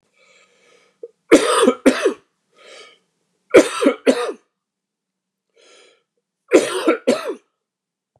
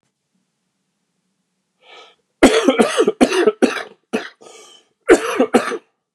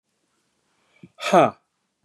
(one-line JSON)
{"three_cough_length": "8.2 s", "three_cough_amplitude": 29294, "three_cough_signal_mean_std_ratio": 0.34, "cough_length": "6.1 s", "cough_amplitude": 29359, "cough_signal_mean_std_ratio": 0.39, "exhalation_length": "2.0 s", "exhalation_amplitude": 23590, "exhalation_signal_mean_std_ratio": 0.26, "survey_phase": "beta (2021-08-13 to 2022-03-07)", "age": "45-64", "gender": "Male", "wearing_mask": "No", "symptom_cough_any": true, "symptom_new_continuous_cough": true, "symptom_runny_or_blocked_nose": true, "symptom_sore_throat": true, "symptom_headache": true, "symptom_onset": "7 days", "smoker_status": "Ex-smoker", "respiratory_condition_asthma": false, "respiratory_condition_other": false, "recruitment_source": "REACT", "submission_delay": "1 day", "covid_test_result": "Negative", "covid_test_method": "RT-qPCR", "influenza_a_test_result": "Unknown/Void", "influenza_b_test_result": "Unknown/Void"}